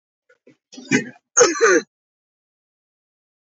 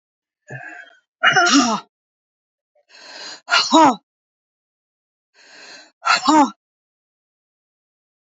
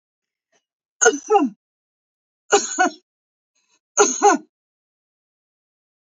{"cough_length": "3.6 s", "cough_amplitude": 26603, "cough_signal_mean_std_ratio": 0.31, "exhalation_length": "8.4 s", "exhalation_amplitude": 32619, "exhalation_signal_mean_std_ratio": 0.34, "three_cough_length": "6.1 s", "three_cough_amplitude": 28655, "three_cough_signal_mean_std_ratio": 0.31, "survey_phase": "beta (2021-08-13 to 2022-03-07)", "age": "65+", "gender": "Female", "wearing_mask": "No", "symptom_none": true, "symptom_onset": "2 days", "smoker_status": "Never smoked", "respiratory_condition_asthma": false, "respiratory_condition_other": false, "recruitment_source": "REACT", "submission_delay": "2 days", "covid_test_result": "Negative", "covid_test_method": "RT-qPCR", "influenza_a_test_result": "Negative", "influenza_b_test_result": "Negative"}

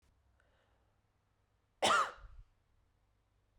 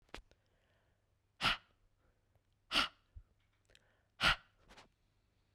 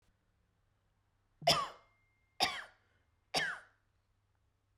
{"cough_length": "3.6 s", "cough_amplitude": 4537, "cough_signal_mean_std_ratio": 0.25, "exhalation_length": "5.5 s", "exhalation_amplitude": 4783, "exhalation_signal_mean_std_ratio": 0.24, "three_cough_length": "4.8 s", "three_cough_amplitude": 7217, "three_cough_signal_mean_std_ratio": 0.28, "survey_phase": "beta (2021-08-13 to 2022-03-07)", "age": "18-44", "gender": "Female", "wearing_mask": "No", "symptom_none": true, "smoker_status": "Never smoked", "respiratory_condition_asthma": false, "respiratory_condition_other": false, "recruitment_source": "Test and Trace", "submission_delay": "2 days", "covid_test_result": "Positive", "covid_test_method": "RT-qPCR", "covid_ct_value": 24.2, "covid_ct_gene": "ORF1ab gene"}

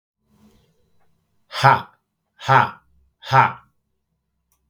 {"exhalation_length": "4.7 s", "exhalation_amplitude": 32768, "exhalation_signal_mean_std_ratio": 0.28, "survey_phase": "beta (2021-08-13 to 2022-03-07)", "age": "45-64", "gender": "Male", "wearing_mask": "No", "symptom_none": true, "smoker_status": "Never smoked", "respiratory_condition_asthma": false, "respiratory_condition_other": false, "recruitment_source": "REACT", "submission_delay": "3 days", "covid_test_result": "Negative", "covid_test_method": "RT-qPCR", "influenza_a_test_result": "Negative", "influenza_b_test_result": "Negative"}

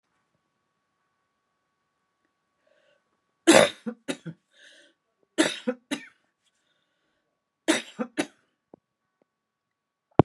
{"three_cough_length": "10.2 s", "three_cough_amplitude": 32767, "three_cough_signal_mean_std_ratio": 0.19, "survey_phase": "beta (2021-08-13 to 2022-03-07)", "age": "65+", "gender": "Female", "wearing_mask": "No", "symptom_none": true, "smoker_status": "Current smoker (1 to 10 cigarettes per day)", "respiratory_condition_asthma": false, "respiratory_condition_other": false, "recruitment_source": "REACT", "submission_delay": "1 day", "covid_test_result": "Negative", "covid_test_method": "RT-qPCR"}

